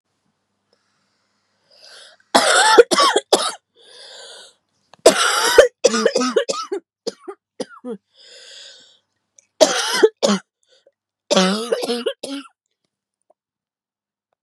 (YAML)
cough_length: 14.4 s
cough_amplitude: 32768
cough_signal_mean_std_ratio: 0.38
survey_phase: beta (2021-08-13 to 2022-03-07)
age: 18-44
gender: Female
wearing_mask: 'No'
symptom_cough_any: true
symptom_new_continuous_cough: true
symptom_runny_or_blocked_nose: true
symptom_sore_throat: true
symptom_fatigue: true
symptom_headache: true
symptom_change_to_sense_of_smell_or_taste: true
symptom_loss_of_taste: true
symptom_other: true
symptom_onset: 8 days
smoker_status: Never smoked
respiratory_condition_asthma: false
respiratory_condition_other: false
recruitment_source: Test and Trace
submission_delay: 2 days
covid_test_result: Positive
covid_test_method: RT-qPCR
covid_ct_value: 17.4
covid_ct_gene: N gene